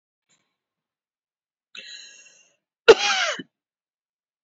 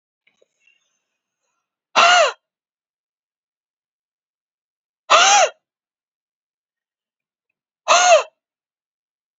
{"cough_length": "4.4 s", "cough_amplitude": 27599, "cough_signal_mean_std_ratio": 0.19, "exhalation_length": "9.4 s", "exhalation_amplitude": 29842, "exhalation_signal_mean_std_ratio": 0.28, "survey_phase": "beta (2021-08-13 to 2022-03-07)", "age": "45-64", "gender": "Female", "wearing_mask": "No", "symptom_diarrhoea": true, "smoker_status": "Never smoked", "respiratory_condition_asthma": false, "respiratory_condition_other": false, "recruitment_source": "REACT", "submission_delay": "2 days", "covid_test_result": "Negative", "covid_test_method": "RT-qPCR"}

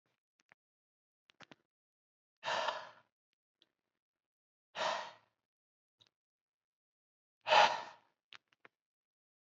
{"exhalation_length": "9.6 s", "exhalation_amplitude": 6931, "exhalation_signal_mean_std_ratio": 0.21, "survey_phase": "alpha (2021-03-01 to 2021-08-12)", "age": "18-44", "gender": "Male", "wearing_mask": "No", "symptom_none": true, "smoker_status": "Never smoked", "respiratory_condition_asthma": false, "respiratory_condition_other": false, "recruitment_source": "REACT", "submission_delay": "1 day", "covid_test_result": "Negative", "covid_test_method": "RT-qPCR"}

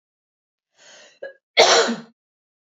{"cough_length": "2.6 s", "cough_amplitude": 29843, "cough_signal_mean_std_ratio": 0.31, "survey_phase": "beta (2021-08-13 to 2022-03-07)", "age": "18-44", "gender": "Female", "wearing_mask": "No", "symptom_cough_any": true, "symptom_runny_or_blocked_nose": true, "smoker_status": "Never smoked", "respiratory_condition_asthma": false, "respiratory_condition_other": false, "recruitment_source": "Test and Trace", "submission_delay": "1 day", "covid_test_result": "Positive", "covid_test_method": "ePCR"}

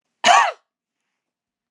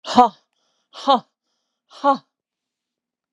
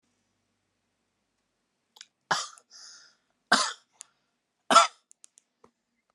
{"cough_length": "1.7 s", "cough_amplitude": 27188, "cough_signal_mean_std_ratio": 0.31, "exhalation_length": "3.3 s", "exhalation_amplitude": 32767, "exhalation_signal_mean_std_ratio": 0.26, "three_cough_length": "6.1 s", "three_cough_amplitude": 20004, "three_cough_signal_mean_std_ratio": 0.2, "survey_phase": "alpha (2021-03-01 to 2021-08-12)", "age": "65+", "gender": "Female", "wearing_mask": "No", "symptom_none": true, "smoker_status": "Never smoked", "respiratory_condition_asthma": false, "respiratory_condition_other": false, "recruitment_source": "REACT", "submission_delay": "1 day", "covid_test_result": "Negative", "covid_test_method": "RT-qPCR"}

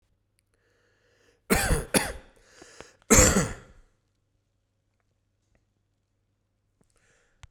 {"cough_length": "7.5 s", "cough_amplitude": 20991, "cough_signal_mean_std_ratio": 0.26, "survey_phase": "beta (2021-08-13 to 2022-03-07)", "age": "45-64", "gender": "Male", "wearing_mask": "No", "symptom_cough_any": true, "symptom_shortness_of_breath": true, "smoker_status": "Ex-smoker", "respiratory_condition_asthma": false, "respiratory_condition_other": false, "recruitment_source": "Test and Trace", "submission_delay": "0 days", "covid_test_result": "Positive", "covid_test_method": "RT-qPCR", "covid_ct_value": 26.6, "covid_ct_gene": "N gene", "covid_ct_mean": 27.2, "covid_viral_load": "1200 copies/ml", "covid_viral_load_category": "Minimal viral load (< 10K copies/ml)"}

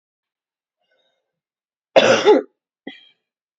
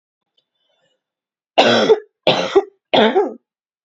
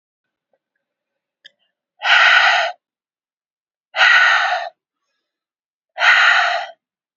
{"cough_length": "3.6 s", "cough_amplitude": 27897, "cough_signal_mean_std_ratio": 0.28, "three_cough_length": "3.8 s", "three_cough_amplitude": 32768, "three_cough_signal_mean_std_ratio": 0.42, "exhalation_length": "7.2 s", "exhalation_amplitude": 28988, "exhalation_signal_mean_std_ratio": 0.44, "survey_phase": "beta (2021-08-13 to 2022-03-07)", "age": "18-44", "gender": "Female", "wearing_mask": "No", "symptom_cough_any": true, "symptom_new_continuous_cough": true, "symptom_fatigue": true, "symptom_headache": true, "symptom_other": true, "symptom_onset": "3 days", "smoker_status": "Never smoked", "respiratory_condition_asthma": false, "respiratory_condition_other": false, "recruitment_source": "Test and Trace", "submission_delay": "2 days", "covid_test_result": "Positive", "covid_test_method": "RT-qPCR", "covid_ct_value": 34.2, "covid_ct_gene": "N gene"}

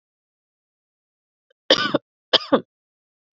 {"cough_length": "3.3 s", "cough_amplitude": 29425, "cough_signal_mean_std_ratio": 0.23, "survey_phase": "beta (2021-08-13 to 2022-03-07)", "age": "18-44", "gender": "Female", "wearing_mask": "No", "symptom_cough_any": true, "symptom_sore_throat": true, "symptom_abdominal_pain": true, "symptom_fever_high_temperature": true, "symptom_headache": true, "smoker_status": "Never smoked", "respiratory_condition_asthma": false, "respiratory_condition_other": false, "recruitment_source": "Test and Trace", "submission_delay": "1 day", "covid_test_result": "Positive", "covid_test_method": "LFT"}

